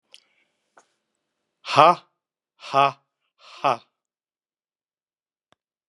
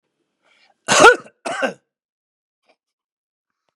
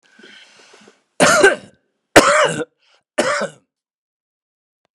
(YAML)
exhalation_length: 5.9 s
exhalation_amplitude: 32651
exhalation_signal_mean_std_ratio: 0.2
cough_length: 3.8 s
cough_amplitude: 32768
cough_signal_mean_std_ratio: 0.24
three_cough_length: 4.9 s
three_cough_amplitude: 32768
three_cough_signal_mean_std_ratio: 0.36
survey_phase: beta (2021-08-13 to 2022-03-07)
age: 65+
gender: Male
wearing_mask: 'No'
symptom_cough_any: true
smoker_status: Never smoked
respiratory_condition_asthma: false
respiratory_condition_other: false
recruitment_source: REACT
submission_delay: 2 days
covid_test_result: Negative
covid_test_method: RT-qPCR
influenza_a_test_result: Negative
influenza_b_test_result: Negative